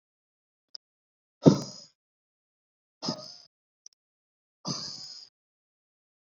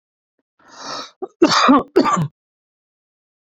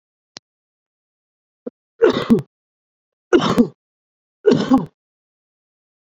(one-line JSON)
{"exhalation_length": "6.3 s", "exhalation_amplitude": 23285, "exhalation_signal_mean_std_ratio": 0.17, "cough_length": "3.6 s", "cough_amplitude": 27378, "cough_signal_mean_std_ratio": 0.38, "three_cough_length": "6.1 s", "three_cough_amplitude": 30224, "three_cough_signal_mean_std_ratio": 0.31, "survey_phase": "beta (2021-08-13 to 2022-03-07)", "age": "18-44", "gender": "Male", "wearing_mask": "No", "symptom_none": true, "smoker_status": "Never smoked", "respiratory_condition_asthma": false, "respiratory_condition_other": false, "recruitment_source": "REACT", "submission_delay": "3 days", "covid_test_result": "Negative", "covid_test_method": "RT-qPCR"}